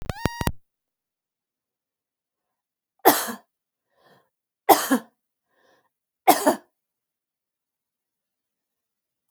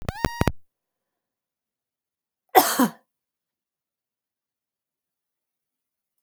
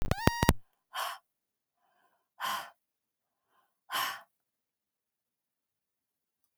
three_cough_length: 9.3 s
three_cough_amplitude: 31697
three_cough_signal_mean_std_ratio: 0.21
cough_length: 6.2 s
cough_amplitude: 29489
cough_signal_mean_std_ratio: 0.2
exhalation_length: 6.6 s
exhalation_amplitude: 25596
exhalation_signal_mean_std_ratio: 0.26
survey_phase: beta (2021-08-13 to 2022-03-07)
age: 45-64
gender: Female
wearing_mask: 'No'
symptom_none: true
smoker_status: Never smoked
respiratory_condition_asthma: false
respiratory_condition_other: false
recruitment_source: REACT
submission_delay: 3 days
covid_test_result: Negative
covid_test_method: RT-qPCR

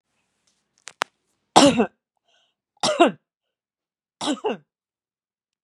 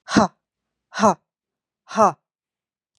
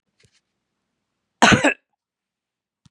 three_cough_length: 5.6 s
three_cough_amplitude: 32768
three_cough_signal_mean_std_ratio: 0.26
exhalation_length: 3.0 s
exhalation_amplitude: 26964
exhalation_signal_mean_std_ratio: 0.29
cough_length: 2.9 s
cough_amplitude: 32767
cough_signal_mean_std_ratio: 0.23
survey_phase: beta (2021-08-13 to 2022-03-07)
age: 45-64
gender: Female
wearing_mask: 'No'
symptom_none: true
smoker_status: Ex-smoker
respiratory_condition_asthma: false
respiratory_condition_other: false
recruitment_source: REACT
submission_delay: 2 days
covid_test_result: Negative
covid_test_method: RT-qPCR
influenza_a_test_result: Negative
influenza_b_test_result: Negative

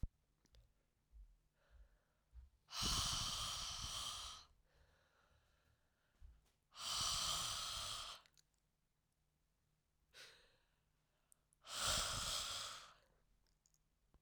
exhalation_length: 14.2 s
exhalation_amplitude: 1474
exhalation_signal_mean_std_ratio: 0.47
survey_phase: alpha (2021-03-01 to 2021-08-12)
age: 18-44
gender: Female
wearing_mask: 'No'
symptom_cough_any: true
symptom_diarrhoea: true
symptom_fatigue: true
symptom_fever_high_temperature: true
symptom_headache: true
smoker_status: Current smoker (e-cigarettes or vapes only)
respiratory_condition_asthma: false
respiratory_condition_other: false
recruitment_source: Test and Trace
submission_delay: 1 day
covid_test_result: Positive
covid_test_method: RT-qPCR
covid_ct_value: 17.2
covid_ct_gene: ORF1ab gene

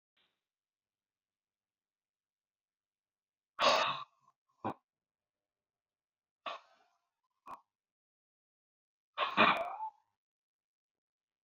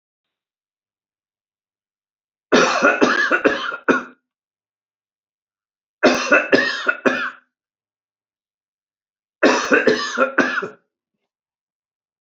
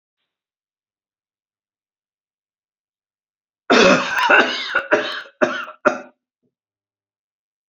exhalation_length: 11.4 s
exhalation_amplitude: 7818
exhalation_signal_mean_std_ratio: 0.23
three_cough_length: 12.2 s
three_cough_amplitude: 30487
three_cough_signal_mean_std_ratio: 0.4
cough_length: 7.7 s
cough_amplitude: 32767
cough_signal_mean_std_ratio: 0.33
survey_phase: alpha (2021-03-01 to 2021-08-12)
age: 65+
gender: Male
wearing_mask: 'No'
symptom_none: true
smoker_status: Ex-smoker
respiratory_condition_asthma: false
respiratory_condition_other: false
recruitment_source: REACT
submission_delay: 2 days
covid_test_result: Negative
covid_test_method: RT-qPCR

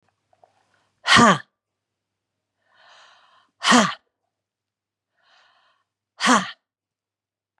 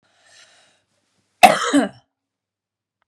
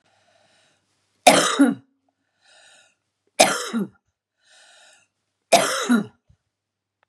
exhalation_length: 7.6 s
exhalation_amplitude: 31404
exhalation_signal_mean_std_ratio: 0.25
cough_length: 3.1 s
cough_amplitude: 32768
cough_signal_mean_std_ratio: 0.25
three_cough_length: 7.1 s
three_cough_amplitude: 32768
three_cough_signal_mean_std_ratio: 0.31
survey_phase: beta (2021-08-13 to 2022-03-07)
age: 45-64
gender: Female
wearing_mask: 'No'
symptom_none: true
symptom_onset: 8 days
smoker_status: Ex-smoker
respiratory_condition_asthma: false
respiratory_condition_other: false
recruitment_source: REACT
submission_delay: 4 days
covid_test_result: Negative
covid_test_method: RT-qPCR
influenza_a_test_result: Negative
influenza_b_test_result: Negative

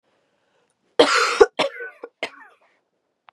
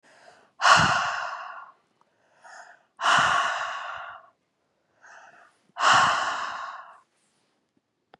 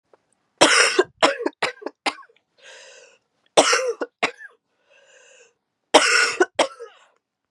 cough_length: 3.3 s
cough_amplitude: 32767
cough_signal_mean_std_ratio: 0.3
exhalation_length: 8.2 s
exhalation_amplitude: 21288
exhalation_signal_mean_std_ratio: 0.43
three_cough_length: 7.5 s
three_cough_amplitude: 32768
three_cough_signal_mean_std_ratio: 0.37
survey_phase: beta (2021-08-13 to 2022-03-07)
age: 18-44
gender: Female
wearing_mask: 'No'
symptom_cough_any: true
symptom_runny_or_blocked_nose: true
symptom_sore_throat: true
symptom_fatigue: true
symptom_headache: true
symptom_change_to_sense_of_smell_or_taste: true
symptom_loss_of_taste: true
symptom_onset: 3 days
smoker_status: Ex-smoker
respiratory_condition_asthma: false
respiratory_condition_other: false
recruitment_source: Test and Trace
submission_delay: 1 day
covid_test_result: Positive
covid_test_method: RT-qPCR
covid_ct_value: 24.4
covid_ct_gene: ORF1ab gene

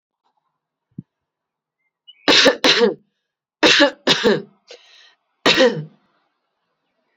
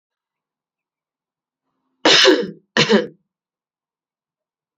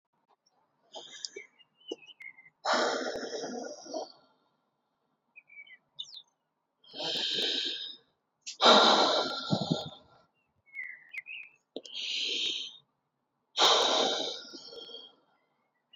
three_cough_length: 7.2 s
three_cough_amplitude: 32767
three_cough_signal_mean_std_ratio: 0.37
cough_length: 4.8 s
cough_amplitude: 32292
cough_signal_mean_std_ratio: 0.3
exhalation_length: 16.0 s
exhalation_amplitude: 13718
exhalation_signal_mean_std_ratio: 0.42
survey_phase: beta (2021-08-13 to 2022-03-07)
age: 18-44
gender: Female
wearing_mask: 'No'
symptom_none: true
smoker_status: Current smoker (1 to 10 cigarettes per day)
respiratory_condition_asthma: false
respiratory_condition_other: false
recruitment_source: REACT
submission_delay: 1 day
covid_test_result: Negative
covid_test_method: RT-qPCR
influenza_a_test_result: Negative
influenza_b_test_result: Negative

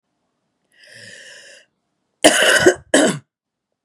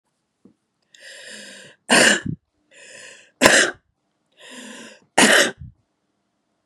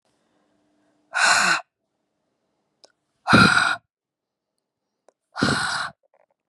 cough_length: 3.8 s
cough_amplitude: 32768
cough_signal_mean_std_ratio: 0.35
three_cough_length: 6.7 s
three_cough_amplitude: 32768
three_cough_signal_mean_std_ratio: 0.33
exhalation_length: 6.5 s
exhalation_amplitude: 31085
exhalation_signal_mean_std_ratio: 0.35
survey_phase: beta (2021-08-13 to 2022-03-07)
age: 45-64
gender: Female
wearing_mask: 'No'
symptom_cough_any: true
symptom_sore_throat: true
symptom_diarrhoea: true
symptom_headache: true
symptom_onset: 2 days
smoker_status: Never smoked
respiratory_condition_asthma: false
respiratory_condition_other: false
recruitment_source: Test and Trace
submission_delay: 2 days
covid_test_result: Positive
covid_test_method: RT-qPCR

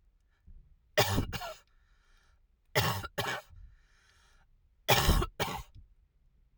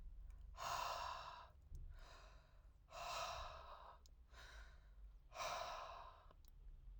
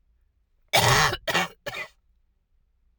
three_cough_length: 6.6 s
three_cough_amplitude: 12767
three_cough_signal_mean_std_ratio: 0.38
exhalation_length: 7.0 s
exhalation_amplitude: 663
exhalation_signal_mean_std_ratio: 0.81
cough_length: 3.0 s
cough_amplitude: 17168
cough_signal_mean_std_ratio: 0.39
survey_phase: alpha (2021-03-01 to 2021-08-12)
age: 45-64
gender: Female
wearing_mask: 'No'
symptom_none: true
smoker_status: Never smoked
respiratory_condition_asthma: false
respiratory_condition_other: false
recruitment_source: REACT
submission_delay: 1 day
covid_test_result: Negative
covid_test_method: RT-qPCR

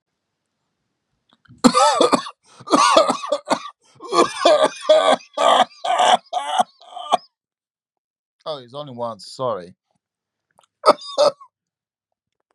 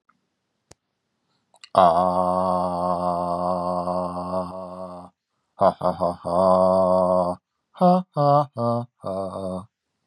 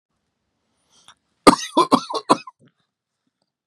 cough_length: 12.5 s
cough_amplitude: 32767
cough_signal_mean_std_ratio: 0.43
exhalation_length: 10.1 s
exhalation_amplitude: 28370
exhalation_signal_mean_std_ratio: 0.59
three_cough_length: 3.7 s
three_cough_amplitude: 32768
three_cough_signal_mean_std_ratio: 0.23
survey_phase: beta (2021-08-13 to 2022-03-07)
age: 18-44
gender: Male
wearing_mask: 'No'
symptom_fatigue: true
symptom_onset: 12 days
smoker_status: Never smoked
respiratory_condition_asthma: false
respiratory_condition_other: false
recruitment_source: REACT
submission_delay: 0 days
covid_test_result: Negative
covid_test_method: RT-qPCR
influenza_a_test_result: Negative
influenza_b_test_result: Negative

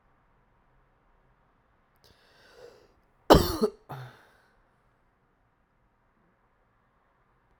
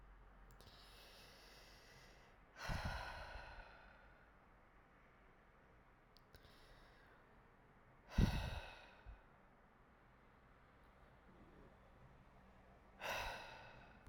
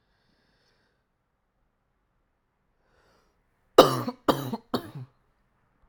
cough_length: 7.6 s
cough_amplitude: 32767
cough_signal_mean_std_ratio: 0.16
exhalation_length: 14.1 s
exhalation_amplitude: 2501
exhalation_signal_mean_std_ratio: 0.38
three_cough_length: 5.9 s
three_cough_amplitude: 32767
three_cough_signal_mean_std_ratio: 0.18
survey_phase: alpha (2021-03-01 to 2021-08-12)
age: 18-44
gender: Male
wearing_mask: 'No'
symptom_cough_any: true
symptom_abdominal_pain: true
symptom_fatigue: true
symptom_fever_high_temperature: true
smoker_status: Current smoker (e-cigarettes or vapes only)
respiratory_condition_asthma: true
respiratory_condition_other: false
recruitment_source: Test and Trace
submission_delay: 2 days
covid_test_result: Positive
covid_test_method: RT-qPCR
covid_ct_value: 17.0
covid_ct_gene: ORF1ab gene
covid_ct_mean: 17.4
covid_viral_load: 1900000 copies/ml
covid_viral_load_category: High viral load (>1M copies/ml)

